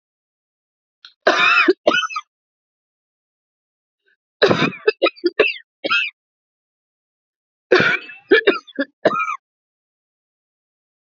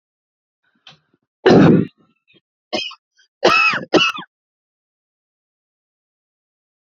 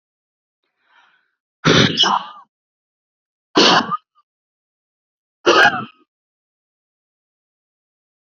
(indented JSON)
{
  "three_cough_length": "11.1 s",
  "three_cough_amplitude": 30171,
  "three_cough_signal_mean_std_ratio": 0.35,
  "cough_length": "6.9 s",
  "cough_amplitude": 29528,
  "cough_signal_mean_std_ratio": 0.31,
  "exhalation_length": "8.4 s",
  "exhalation_amplitude": 31056,
  "exhalation_signal_mean_std_ratio": 0.3,
  "survey_phase": "beta (2021-08-13 to 2022-03-07)",
  "age": "18-44",
  "gender": "Female",
  "wearing_mask": "No",
  "symptom_cough_any": true,
  "symptom_shortness_of_breath": true,
  "symptom_onset": "12 days",
  "smoker_status": "Ex-smoker",
  "respiratory_condition_asthma": true,
  "respiratory_condition_other": true,
  "recruitment_source": "REACT",
  "submission_delay": "1 day",
  "covid_test_result": "Negative",
  "covid_test_method": "RT-qPCR"
}